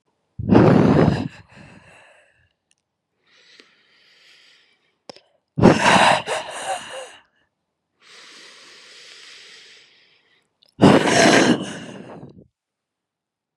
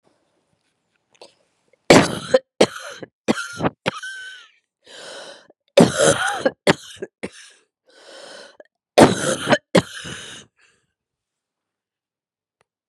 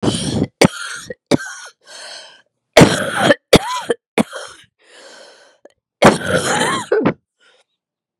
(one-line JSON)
{"exhalation_length": "13.6 s", "exhalation_amplitude": 32767, "exhalation_signal_mean_std_ratio": 0.35, "three_cough_length": "12.9 s", "three_cough_amplitude": 32768, "three_cough_signal_mean_std_ratio": 0.3, "cough_length": "8.2 s", "cough_amplitude": 32768, "cough_signal_mean_std_ratio": 0.41, "survey_phase": "beta (2021-08-13 to 2022-03-07)", "age": "65+", "gender": "Female", "wearing_mask": "No", "symptom_cough_any": true, "symptom_new_continuous_cough": true, "symptom_runny_or_blocked_nose": true, "symptom_sore_throat": true, "symptom_abdominal_pain": true, "symptom_fatigue": true, "symptom_fever_high_temperature": true, "symptom_headache": true, "symptom_change_to_sense_of_smell_or_taste": true, "symptom_onset": "2 days", "smoker_status": "Never smoked", "respiratory_condition_asthma": false, "respiratory_condition_other": false, "recruitment_source": "Test and Trace", "submission_delay": "0 days", "covid_test_result": "Positive", "covid_test_method": "ePCR"}